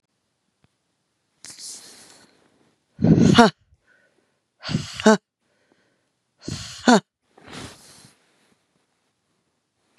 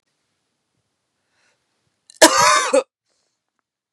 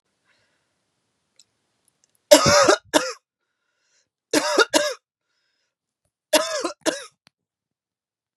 {"exhalation_length": "10.0 s", "exhalation_amplitude": 32767, "exhalation_signal_mean_std_ratio": 0.24, "cough_length": "3.9 s", "cough_amplitude": 32768, "cough_signal_mean_std_ratio": 0.28, "three_cough_length": "8.4 s", "three_cough_amplitude": 32768, "three_cough_signal_mean_std_ratio": 0.3, "survey_phase": "beta (2021-08-13 to 2022-03-07)", "age": "18-44", "gender": "Female", "wearing_mask": "No", "symptom_none": true, "smoker_status": "Never smoked", "respiratory_condition_asthma": false, "respiratory_condition_other": false, "recruitment_source": "REACT", "submission_delay": "1 day", "covid_test_result": "Negative", "covid_test_method": "RT-qPCR", "influenza_a_test_result": "Unknown/Void", "influenza_b_test_result": "Unknown/Void"}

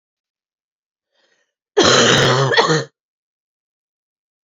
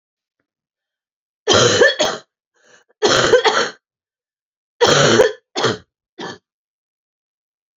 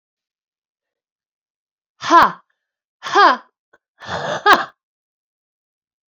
{"cough_length": "4.4 s", "cough_amplitude": 30954, "cough_signal_mean_std_ratio": 0.4, "three_cough_length": "7.8 s", "three_cough_amplitude": 32205, "three_cough_signal_mean_std_ratio": 0.41, "exhalation_length": "6.1 s", "exhalation_amplitude": 29870, "exhalation_signal_mean_std_ratio": 0.28, "survey_phase": "beta (2021-08-13 to 2022-03-07)", "age": "45-64", "gender": "Female", "wearing_mask": "No", "symptom_cough_any": true, "symptom_runny_or_blocked_nose": true, "symptom_shortness_of_breath": true, "symptom_fatigue": true, "symptom_headache": true, "symptom_onset": "6 days", "smoker_status": "Ex-smoker", "respiratory_condition_asthma": true, "respiratory_condition_other": false, "recruitment_source": "Test and Trace", "submission_delay": "2 days", "covid_test_result": "Negative", "covid_test_method": "RT-qPCR"}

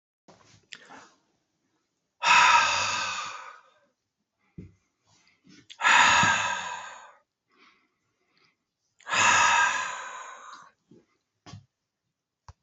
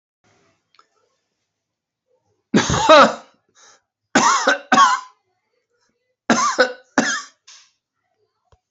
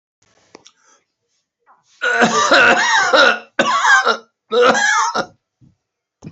{"exhalation_length": "12.6 s", "exhalation_amplitude": 15644, "exhalation_signal_mean_std_ratio": 0.38, "three_cough_length": "8.7 s", "three_cough_amplitude": 32767, "three_cough_signal_mean_std_ratio": 0.35, "cough_length": "6.3 s", "cough_amplitude": 32767, "cough_signal_mean_std_ratio": 0.56, "survey_phase": "alpha (2021-03-01 to 2021-08-12)", "age": "65+", "gender": "Male", "wearing_mask": "No", "symptom_none": true, "smoker_status": "Ex-smoker", "respiratory_condition_asthma": false, "respiratory_condition_other": false, "recruitment_source": "REACT", "submission_delay": "2 days", "covid_test_result": "Negative", "covid_test_method": "RT-qPCR"}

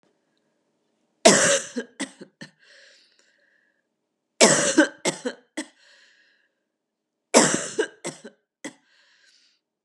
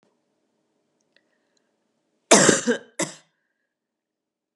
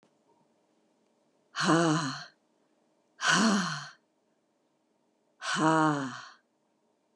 {"three_cough_length": "9.8 s", "three_cough_amplitude": 31793, "three_cough_signal_mean_std_ratio": 0.29, "cough_length": "4.6 s", "cough_amplitude": 29805, "cough_signal_mean_std_ratio": 0.23, "exhalation_length": "7.2 s", "exhalation_amplitude": 9117, "exhalation_signal_mean_std_ratio": 0.41, "survey_phase": "beta (2021-08-13 to 2022-03-07)", "age": "45-64", "gender": "Female", "wearing_mask": "No", "symptom_cough_any": true, "symptom_runny_or_blocked_nose": true, "symptom_shortness_of_breath": true, "symptom_fatigue": true, "symptom_fever_high_temperature": true, "symptom_onset": "2 days", "smoker_status": "Never smoked", "respiratory_condition_asthma": false, "respiratory_condition_other": false, "recruitment_source": "Test and Trace", "submission_delay": "1 day", "covid_test_result": "Positive", "covid_test_method": "RT-qPCR", "covid_ct_value": 18.7, "covid_ct_gene": "ORF1ab gene", "covid_ct_mean": 18.9, "covid_viral_load": "650000 copies/ml", "covid_viral_load_category": "Low viral load (10K-1M copies/ml)"}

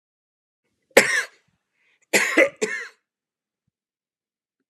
{"cough_length": "4.7 s", "cough_amplitude": 32767, "cough_signal_mean_std_ratio": 0.28, "survey_phase": "alpha (2021-03-01 to 2021-08-12)", "age": "45-64", "gender": "Male", "wearing_mask": "No", "symptom_none": true, "symptom_onset": "12 days", "smoker_status": "Never smoked", "respiratory_condition_asthma": false, "respiratory_condition_other": false, "recruitment_source": "REACT", "submission_delay": "1 day", "covid_test_result": "Negative", "covid_test_method": "RT-qPCR"}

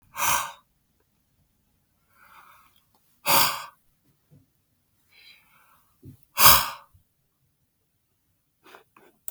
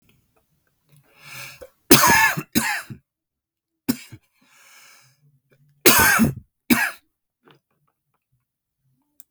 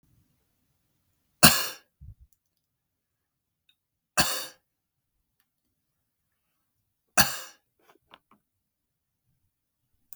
{"exhalation_length": "9.3 s", "exhalation_amplitude": 32043, "exhalation_signal_mean_std_ratio": 0.22, "cough_length": "9.3 s", "cough_amplitude": 32768, "cough_signal_mean_std_ratio": 0.31, "three_cough_length": "10.2 s", "three_cough_amplitude": 32768, "three_cough_signal_mean_std_ratio": 0.16, "survey_phase": "beta (2021-08-13 to 2022-03-07)", "age": "18-44", "gender": "Male", "wearing_mask": "No", "symptom_cough_any": true, "symptom_fatigue": true, "symptom_onset": "7 days", "smoker_status": "Never smoked", "respiratory_condition_asthma": false, "respiratory_condition_other": false, "recruitment_source": "Test and Trace", "submission_delay": "2 days", "covid_test_result": "Positive", "covid_test_method": "ePCR"}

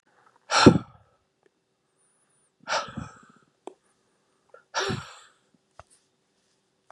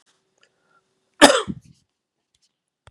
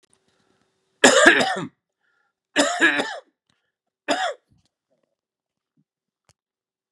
{"exhalation_length": "6.9 s", "exhalation_amplitude": 32725, "exhalation_signal_mean_std_ratio": 0.21, "cough_length": "2.9 s", "cough_amplitude": 32768, "cough_signal_mean_std_ratio": 0.19, "three_cough_length": "6.9 s", "three_cough_amplitude": 32768, "three_cough_signal_mean_std_ratio": 0.31, "survey_phase": "beta (2021-08-13 to 2022-03-07)", "age": "45-64", "gender": "Male", "wearing_mask": "No", "symptom_cough_any": true, "symptom_runny_or_blocked_nose": true, "symptom_fatigue": true, "symptom_onset": "3 days", "smoker_status": "Never smoked", "respiratory_condition_asthma": false, "respiratory_condition_other": false, "recruitment_source": "Test and Trace", "submission_delay": "2 days", "covid_test_result": "Positive", "covid_test_method": "RT-qPCR", "covid_ct_value": 17.8, "covid_ct_gene": "ORF1ab gene", "covid_ct_mean": 19.1, "covid_viral_load": "550000 copies/ml", "covid_viral_load_category": "Low viral load (10K-1M copies/ml)"}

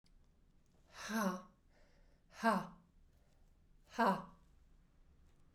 {"exhalation_length": "5.5 s", "exhalation_amplitude": 3798, "exhalation_signal_mean_std_ratio": 0.34, "survey_phase": "beta (2021-08-13 to 2022-03-07)", "age": "18-44", "gender": "Female", "wearing_mask": "No", "symptom_cough_any": true, "symptom_shortness_of_breath": true, "symptom_diarrhoea": true, "symptom_fatigue": true, "symptom_change_to_sense_of_smell_or_taste": true, "symptom_loss_of_taste": true, "symptom_other": true, "smoker_status": "Never smoked", "respiratory_condition_asthma": true, "respiratory_condition_other": false, "recruitment_source": "Test and Trace", "submission_delay": "2 days", "covid_test_result": "Positive", "covid_test_method": "RT-qPCR", "covid_ct_value": 20.1, "covid_ct_gene": "ORF1ab gene", "covid_ct_mean": 20.3, "covid_viral_load": "210000 copies/ml", "covid_viral_load_category": "Low viral load (10K-1M copies/ml)"}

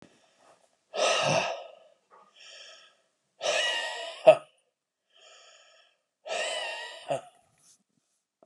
{"exhalation_length": "8.5 s", "exhalation_amplitude": 20295, "exhalation_signal_mean_std_ratio": 0.33, "survey_phase": "beta (2021-08-13 to 2022-03-07)", "age": "45-64", "gender": "Male", "wearing_mask": "No", "symptom_none": true, "smoker_status": "Never smoked", "respiratory_condition_asthma": false, "respiratory_condition_other": false, "recruitment_source": "REACT", "submission_delay": "2 days", "covid_test_result": "Negative", "covid_test_method": "RT-qPCR", "influenza_a_test_result": "Unknown/Void", "influenza_b_test_result": "Unknown/Void"}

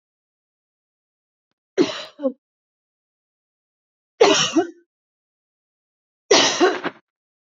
{"three_cough_length": "7.4 s", "three_cough_amplitude": 31080, "three_cough_signal_mean_std_ratio": 0.3, "survey_phase": "beta (2021-08-13 to 2022-03-07)", "age": "45-64", "gender": "Female", "wearing_mask": "No", "symptom_none": true, "smoker_status": "Never smoked", "respiratory_condition_asthma": false, "respiratory_condition_other": false, "recruitment_source": "REACT", "submission_delay": "1 day", "covid_test_result": "Negative", "covid_test_method": "RT-qPCR", "influenza_a_test_result": "Negative", "influenza_b_test_result": "Negative"}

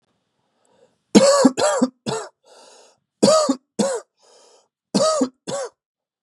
{"cough_length": "6.2 s", "cough_amplitude": 32768, "cough_signal_mean_std_ratio": 0.42, "survey_phase": "beta (2021-08-13 to 2022-03-07)", "age": "18-44", "gender": "Male", "wearing_mask": "No", "symptom_fatigue": true, "symptom_fever_high_temperature": true, "symptom_onset": "8 days", "smoker_status": "Never smoked", "respiratory_condition_asthma": false, "respiratory_condition_other": false, "recruitment_source": "Test and Trace", "submission_delay": "1 day", "covid_test_result": "Positive", "covid_test_method": "RT-qPCR", "covid_ct_value": 22.9, "covid_ct_gene": "N gene"}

